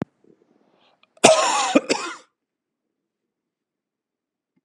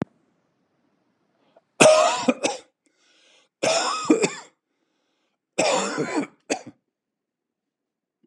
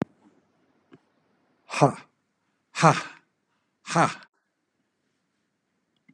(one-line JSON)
{"cough_length": "4.6 s", "cough_amplitude": 32768, "cough_signal_mean_std_ratio": 0.28, "three_cough_length": "8.3 s", "three_cough_amplitude": 32754, "three_cough_signal_mean_std_ratio": 0.36, "exhalation_length": "6.1 s", "exhalation_amplitude": 22542, "exhalation_signal_mean_std_ratio": 0.23, "survey_phase": "beta (2021-08-13 to 2022-03-07)", "age": "45-64", "gender": "Male", "wearing_mask": "No", "symptom_none": true, "smoker_status": "Never smoked", "respiratory_condition_asthma": false, "respiratory_condition_other": false, "recruitment_source": "REACT", "submission_delay": "2 days", "covid_test_result": "Negative", "covid_test_method": "RT-qPCR", "influenza_a_test_result": "Negative", "influenza_b_test_result": "Negative"}